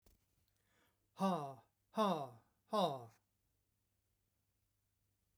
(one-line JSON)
{"exhalation_length": "5.4 s", "exhalation_amplitude": 2421, "exhalation_signal_mean_std_ratio": 0.33, "survey_phase": "beta (2021-08-13 to 2022-03-07)", "age": "65+", "gender": "Male", "wearing_mask": "No", "symptom_cough_any": true, "smoker_status": "Never smoked", "respiratory_condition_asthma": false, "respiratory_condition_other": false, "recruitment_source": "REACT", "submission_delay": "2 days", "covid_test_result": "Negative", "covid_test_method": "RT-qPCR", "influenza_a_test_result": "Negative", "influenza_b_test_result": "Negative"}